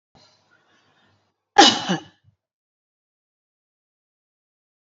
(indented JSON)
{
  "cough_length": "4.9 s",
  "cough_amplitude": 29592,
  "cough_signal_mean_std_ratio": 0.18,
  "survey_phase": "beta (2021-08-13 to 2022-03-07)",
  "age": "45-64",
  "gender": "Female",
  "wearing_mask": "No",
  "symptom_none": true,
  "smoker_status": "Ex-smoker",
  "respiratory_condition_asthma": false,
  "respiratory_condition_other": false,
  "recruitment_source": "REACT",
  "submission_delay": "5 days",
  "covid_test_result": "Negative",
  "covid_test_method": "RT-qPCR",
  "influenza_a_test_result": "Negative",
  "influenza_b_test_result": "Negative"
}